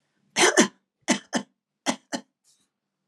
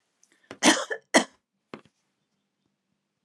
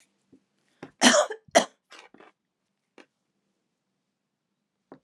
{"three_cough_length": "3.1 s", "three_cough_amplitude": 23237, "three_cough_signal_mean_std_ratio": 0.31, "cough_length": "3.2 s", "cough_amplitude": 21990, "cough_signal_mean_std_ratio": 0.23, "exhalation_length": "5.0 s", "exhalation_amplitude": 24337, "exhalation_signal_mean_std_ratio": 0.21, "survey_phase": "beta (2021-08-13 to 2022-03-07)", "age": "65+", "gender": "Female", "wearing_mask": "No", "symptom_none": true, "smoker_status": "Never smoked", "respiratory_condition_asthma": false, "respiratory_condition_other": false, "recruitment_source": "REACT", "submission_delay": "4 days", "covid_test_result": "Negative", "covid_test_method": "RT-qPCR", "influenza_a_test_result": "Negative", "influenza_b_test_result": "Negative"}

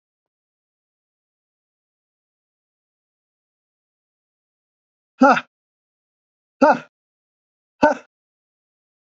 {"exhalation_length": "9.0 s", "exhalation_amplitude": 28243, "exhalation_signal_mean_std_ratio": 0.17, "survey_phase": "beta (2021-08-13 to 2022-03-07)", "age": "65+", "gender": "Male", "wearing_mask": "No", "symptom_cough_any": true, "symptom_runny_or_blocked_nose": true, "symptom_fatigue": true, "symptom_headache": true, "smoker_status": "Never smoked", "respiratory_condition_asthma": true, "respiratory_condition_other": false, "recruitment_source": "Test and Trace", "submission_delay": "2 days", "covid_test_result": "Positive", "covid_test_method": "RT-qPCR", "covid_ct_value": 14.6, "covid_ct_gene": "ORF1ab gene", "covid_ct_mean": 14.9, "covid_viral_load": "13000000 copies/ml", "covid_viral_load_category": "High viral load (>1M copies/ml)"}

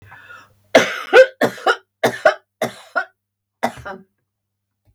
{"cough_length": "4.9 s", "cough_amplitude": 32768, "cough_signal_mean_std_ratio": 0.32, "survey_phase": "beta (2021-08-13 to 2022-03-07)", "age": "65+", "gender": "Female", "wearing_mask": "No", "symptom_none": true, "smoker_status": "Ex-smoker", "respiratory_condition_asthma": false, "respiratory_condition_other": false, "recruitment_source": "REACT", "submission_delay": "1 day", "covid_test_result": "Negative", "covid_test_method": "RT-qPCR"}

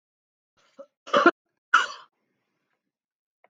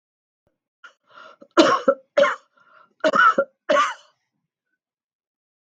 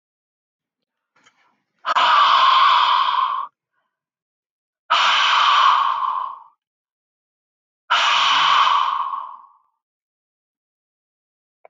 {"cough_length": "3.5 s", "cough_amplitude": 19551, "cough_signal_mean_std_ratio": 0.22, "three_cough_length": "5.7 s", "three_cough_amplitude": 32768, "three_cough_signal_mean_std_ratio": 0.35, "exhalation_length": "11.7 s", "exhalation_amplitude": 22315, "exhalation_signal_mean_std_ratio": 0.53, "survey_phase": "beta (2021-08-13 to 2022-03-07)", "age": "65+", "gender": "Female", "wearing_mask": "No", "symptom_none": true, "smoker_status": "Ex-smoker", "respiratory_condition_asthma": false, "respiratory_condition_other": false, "recruitment_source": "REACT", "submission_delay": "1 day", "covid_test_result": "Negative", "covid_test_method": "RT-qPCR", "influenza_a_test_result": "Negative", "influenza_b_test_result": "Negative"}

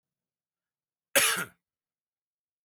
{"cough_length": "2.6 s", "cough_amplitude": 11364, "cough_signal_mean_std_ratio": 0.24, "survey_phase": "alpha (2021-03-01 to 2021-08-12)", "age": "18-44", "gender": "Male", "wearing_mask": "No", "symptom_none": true, "smoker_status": "Never smoked", "respiratory_condition_asthma": false, "respiratory_condition_other": false, "recruitment_source": "REACT", "submission_delay": "1 day", "covid_test_result": "Negative", "covid_test_method": "RT-qPCR"}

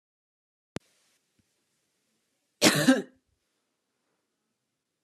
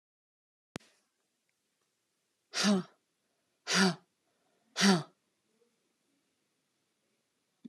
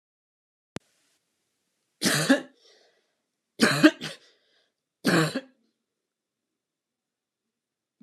{"cough_length": "5.0 s", "cough_amplitude": 18245, "cough_signal_mean_std_ratio": 0.21, "exhalation_length": "7.7 s", "exhalation_amplitude": 8744, "exhalation_signal_mean_std_ratio": 0.25, "three_cough_length": "8.0 s", "three_cough_amplitude": 25452, "three_cough_signal_mean_std_ratio": 0.26, "survey_phase": "beta (2021-08-13 to 2022-03-07)", "age": "45-64", "gender": "Female", "wearing_mask": "Yes", "symptom_none": true, "smoker_status": "Never smoked", "respiratory_condition_asthma": false, "respiratory_condition_other": false, "recruitment_source": "Test and Trace", "submission_delay": "0 days", "covid_test_result": "Negative", "covid_test_method": "LFT"}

